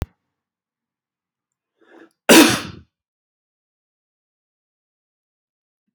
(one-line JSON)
{"cough_length": "5.9 s", "cough_amplitude": 32768, "cough_signal_mean_std_ratio": 0.18, "survey_phase": "beta (2021-08-13 to 2022-03-07)", "age": "65+", "gender": "Male", "wearing_mask": "No", "symptom_none": true, "symptom_onset": "12 days", "smoker_status": "Never smoked", "respiratory_condition_asthma": false, "respiratory_condition_other": false, "recruitment_source": "REACT", "submission_delay": "1 day", "covid_test_result": "Negative", "covid_test_method": "RT-qPCR"}